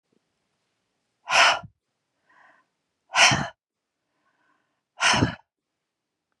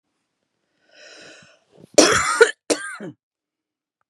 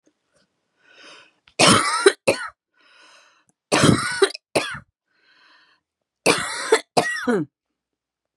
{"exhalation_length": "6.4 s", "exhalation_amplitude": 22934, "exhalation_signal_mean_std_ratio": 0.29, "cough_length": "4.1 s", "cough_amplitude": 32768, "cough_signal_mean_std_ratio": 0.29, "three_cough_length": "8.4 s", "three_cough_amplitude": 31416, "three_cough_signal_mean_std_ratio": 0.37, "survey_phase": "beta (2021-08-13 to 2022-03-07)", "age": "45-64", "gender": "Female", "wearing_mask": "No", "symptom_none": true, "smoker_status": "Never smoked", "respiratory_condition_asthma": false, "respiratory_condition_other": false, "recruitment_source": "REACT", "submission_delay": "1 day", "covid_test_result": "Negative", "covid_test_method": "RT-qPCR", "influenza_a_test_result": "Negative", "influenza_b_test_result": "Negative"}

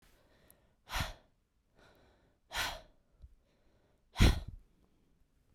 {"exhalation_length": "5.5 s", "exhalation_amplitude": 7966, "exhalation_signal_mean_std_ratio": 0.24, "survey_phase": "beta (2021-08-13 to 2022-03-07)", "age": "18-44", "gender": "Female", "wearing_mask": "No", "symptom_cough_any": true, "symptom_runny_or_blocked_nose": true, "symptom_shortness_of_breath": true, "symptom_sore_throat": true, "symptom_fatigue": true, "symptom_fever_high_temperature": true, "symptom_headache": true, "symptom_change_to_sense_of_smell_or_taste": true, "smoker_status": "Never smoked", "respiratory_condition_asthma": false, "respiratory_condition_other": false, "recruitment_source": "Test and Trace", "submission_delay": "2 days", "covid_test_result": "Positive", "covid_test_method": "RT-qPCR"}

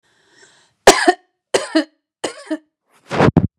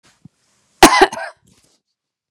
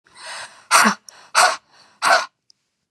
{"three_cough_length": "3.6 s", "three_cough_amplitude": 32768, "three_cough_signal_mean_std_ratio": 0.33, "cough_length": "2.3 s", "cough_amplitude": 32768, "cough_signal_mean_std_ratio": 0.26, "exhalation_length": "2.9 s", "exhalation_amplitude": 32767, "exhalation_signal_mean_std_ratio": 0.4, "survey_phase": "beta (2021-08-13 to 2022-03-07)", "age": "45-64", "gender": "Female", "wearing_mask": "No", "symptom_none": true, "smoker_status": "Ex-smoker", "respiratory_condition_asthma": false, "respiratory_condition_other": false, "recruitment_source": "REACT", "submission_delay": "1 day", "covid_test_result": "Negative", "covid_test_method": "RT-qPCR", "influenza_a_test_result": "Negative", "influenza_b_test_result": "Negative"}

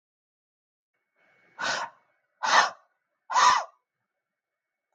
{"exhalation_length": "4.9 s", "exhalation_amplitude": 16576, "exhalation_signal_mean_std_ratio": 0.31, "survey_phase": "beta (2021-08-13 to 2022-03-07)", "age": "45-64", "gender": "Female", "wearing_mask": "No", "symptom_runny_or_blocked_nose": true, "symptom_change_to_sense_of_smell_or_taste": true, "symptom_loss_of_taste": true, "smoker_status": "Never smoked", "respiratory_condition_asthma": false, "respiratory_condition_other": false, "recruitment_source": "Test and Trace", "submission_delay": "2 days", "covid_test_result": "Positive", "covid_test_method": "RT-qPCR", "covid_ct_value": 17.6, "covid_ct_gene": "ORF1ab gene", "covid_ct_mean": 18.0, "covid_viral_load": "1200000 copies/ml", "covid_viral_load_category": "High viral load (>1M copies/ml)"}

